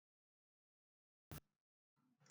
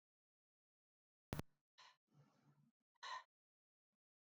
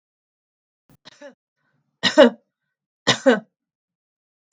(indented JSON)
{
  "cough_length": "2.3 s",
  "cough_amplitude": 348,
  "cough_signal_mean_std_ratio": 0.18,
  "exhalation_length": "4.4 s",
  "exhalation_amplitude": 1131,
  "exhalation_signal_mean_std_ratio": 0.22,
  "three_cough_length": "4.5 s",
  "three_cough_amplitude": 32767,
  "three_cough_signal_mean_std_ratio": 0.22,
  "survey_phase": "beta (2021-08-13 to 2022-03-07)",
  "age": "65+",
  "gender": "Female",
  "wearing_mask": "No",
  "symptom_none": true,
  "smoker_status": "Ex-smoker",
  "respiratory_condition_asthma": false,
  "respiratory_condition_other": false,
  "recruitment_source": "REACT",
  "submission_delay": "3 days",
  "covid_test_result": "Negative",
  "covid_test_method": "RT-qPCR",
  "influenza_a_test_result": "Negative",
  "influenza_b_test_result": "Negative"
}